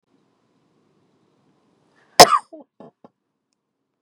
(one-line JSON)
{"cough_length": "4.0 s", "cough_amplitude": 32768, "cough_signal_mean_std_ratio": 0.14, "survey_phase": "beta (2021-08-13 to 2022-03-07)", "age": "18-44", "gender": "Female", "wearing_mask": "No", "symptom_runny_or_blocked_nose": true, "symptom_sore_throat": true, "symptom_diarrhoea": true, "symptom_headache": true, "smoker_status": "Ex-smoker", "respiratory_condition_asthma": false, "respiratory_condition_other": false, "recruitment_source": "REACT", "submission_delay": "1 day", "covid_test_result": "Negative", "covid_test_method": "RT-qPCR", "influenza_a_test_result": "Unknown/Void", "influenza_b_test_result": "Unknown/Void"}